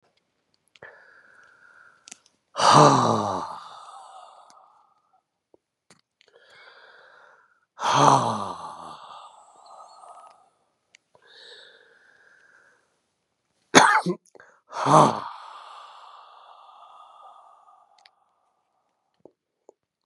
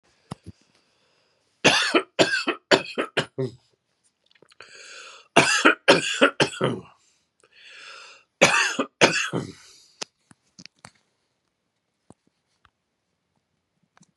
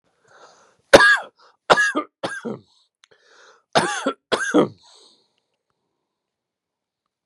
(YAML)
exhalation_length: 20.1 s
exhalation_amplitude: 32768
exhalation_signal_mean_std_ratio: 0.27
three_cough_length: 14.2 s
three_cough_amplitude: 32416
three_cough_signal_mean_std_ratio: 0.33
cough_length: 7.3 s
cough_amplitude: 32768
cough_signal_mean_std_ratio: 0.3
survey_phase: beta (2021-08-13 to 2022-03-07)
age: 45-64
gender: Male
wearing_mask: 'No'
symptom_none: true
smoker_status: Ex-smoker
respiratory_condition_asthma: true
respiratory_condition_other: true
recruitment_source: REACT
submission_delay: 2 days
covid_test_result: Negative
covid_test_method: RT-qPCR
influenza_a_test_result: Negative
influenza_b_test_result: Negative